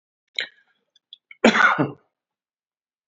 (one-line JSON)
{"cough_length": "3.1 s", "cough_amplitude": 27370, "cough_signal_mean_std_ratio": 0.29, "survey_phase": "beta (2021-08-13 to 2022-03-07)", "age": "45-64", "gender": "Male", "wearing_mask": "No", "symptom_cough_any": true, "symptom_runny_or_blocked_nose": true, "symptom_headache": true, "smoker_status": "Ex-smoker", "respiratory_condition_asthma": false, "respiratory_condition_other": true, "recruitment_source": "Test and Trace", "submission_delay": "1 day", "covid_test_result": "Positive", "covid_test_method": "RT-qPCR", "covid_ct_value": 16.8, "covid_ct_gene": "ORF1ab gene", "covid_ct_mean": 17.4, "covid_viral_load": "1900000 copies/ml", "covid_viral_load_category": "High viral load (>1M copies/ml)"}